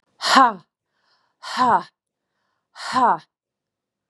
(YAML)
exhalation_length: 4.1 s
exhalation_amplitude: 32216
exhalation_signal_mean_std_ratio: 0.36
survey_phase: beta (2021-08-13 to 2022-03-07)
age: 45-64
gender: Female
wearing_mask: 'No'
symptom_none: true
smoker_status: Never smoked
respiratory_condition_asthma: false
respiratory_condition_other: false
recruitment_source: REACT
submission_delay: 2 days
covid_test_result: Negative
covid_test_method: RT-qPCR
influenza_a_test_result: Negative
influenza_b_test_result: Negative